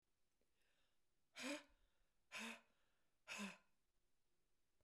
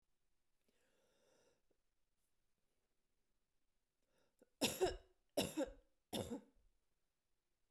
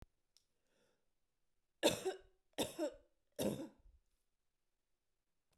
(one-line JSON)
{"exhalation_length": "4.8 s", "exhalation_amplitude": 464, "exhalation_signal_mean_std_ratio": 0.38, "cough_length": "7.7 s", "cough_amplitude": 2134, "cough_signal_mean_std_ratio": 0.26, "three_cough_length": "5.6 s", "three_cough_amplitude": 3630, "three_cough_signal_mean_std_ratio": 0.28, "survey_phase": "beta (2021-08-13 to 2022-03-07)", "age": "65+", "gender": "Female", "wearing_mask": "No", "symptom_none": true, "smoker_status": "Never smoked", "respiratory_condition_asthma": false, "respiratory_condition_other": false, "recruitment_source": "Test and Trace", "submission_delay": "0 days", "covid_test_result": "Negative", "covid_test_method": "LFT"}